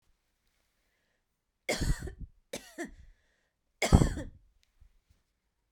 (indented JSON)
{
  "three_cough_length": "5.7 s",
  "three_cough_amplitude": 16208,
  "three_cough_signal_mean_std_ratio": 0.25,
  "survey_phase": "beta (2021-08-13 to 2022-03-07)",
  "age": "18-44",
  "gender": "Female",
  "wearing_mask": "No",
  "symptom_change_to_sense_of_smell_or_taste": true,
  "smoker_status": "Never smoked",
  "respiratory_condition_asthma": false,
  "respiratory_condition_other": false,
  "recruitment_source": "REACT",
  "submission_delay": "1 day",
  "covid_test_result": "Negative",
  "covid_test_method": "RT-qPCR",
  "influenza_a_test_result": "Negative",
  "influenza_b_test_result": "Negative"
}